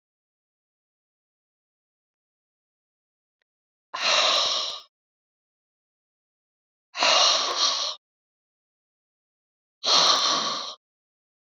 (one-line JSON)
{"exhalation_length": "11.4 s", "exhalation_amplitude": 18229, "exhalation_signal_mean_std_ratio": 0.37, "survey_phase": "beta (2021-08-13 to 2022-03-07)", "age": "45-64", "gender": "Female", "wearing_mask": "No", "symptom_none": true, "smoker_status": "Never smoked", "respiratory_condition_asthma": false, "respiratory_condition_other": false, "recruitment_source": "REACT", "submission_delay": "1 day", "covid_test_result": "Negative", "covid_test_method": "RT-qPCR"}